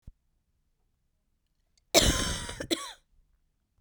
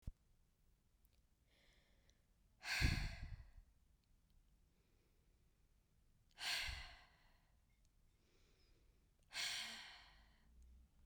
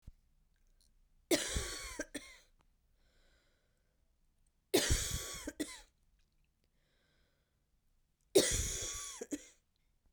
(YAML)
cough_length: 3.8 s
cough_amplitude: 16244
cough_signal_mean_std_ratio: 0.3
exhalation_length: 11.1 s
exhalation_amplitude: 1962
exhalation_signal_mean_std_ratio: 0.34
three_cough_length: 10.1 s
three_cough_amplitude: 6092
three_cough_signal_mean_std_ratio: 0.33
survey_phase: beta (2021-08-13 to 2022-03-07)
age: 18-44
gender: Female
wearing_mask: 'No'
symptom_cough_any: true
symptom_runny_or_blocked_nose: true
symptom_fatigue: true
symptom_headache: true
symptom_onset: 3 days
smoker_status: Never smoked
respiratory_condition_asthma: false
respiratory_condition_other: false
recruitment_source: Test and Trace
submission_delay: 2 days
covid_test_result: Positive
covid_test_method: ePCR